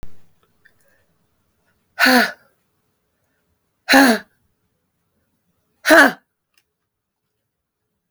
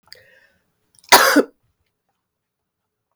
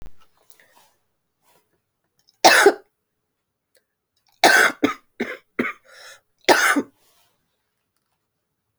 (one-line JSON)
{"exhalation_length": "8.1 s", "exhalation_amplitude": 31888, "exhalation_signal_mean_std_ratio": 0.26, "cough_length": "3.2 s", "cough_amplitude": 32768, "cough_signal_mean_std_ratio": 0.24, "three_cough_length": "8.8 s", "three_cough_amplitude": 30056, "three_cough_signal_mean_std_ratio": 0.28, "survey_phase": "beta (2021-08-13 to 2022-03-07)", "age": "45-64", "gender": "Female", "wearing_mask": "No", "symptom_runny_or_blocked_nose": true, "symptom_abdominal_pain": true, "symptom_diarrhoea": true, "symptom_fatigue": true, "symptom_fever_high_temperature": true, "symptom_headache": true, "symptom_onset": "6 days", "smoker_status": "Never smoked", "respiratory_condition_asthma": false, "respiratory_condition_other": false, "recruitment_source": "Test and Trace", "submission_delay": "2 days", "covid_test_result": "Positive", "covid_test_method": "RT-qPCR"}